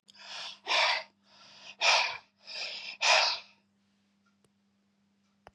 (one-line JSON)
{"exhalation_length": "5.5 s", "exhalation_amplitude": 8692, "exhalation_signal_mean_std_ratio": 0.4, "survey_phase": "beta (2021-08-13 to 2022-03-07)", "age": "65+", "gender": "Male", "wearing_mask": "No", "symptom_none": true, "smoker_status": "Never smoked", "respiratory_condition_asthma": false, "respiratory_condition_other": false, "recruitment_source": "REACT", "submission_delay": "2 days", "covid_test_result": "Negative", "covid_test_method": "RT-qPCR", "influenza_a_test_result": "Negative", "influenza_b_test_result": "Negative"}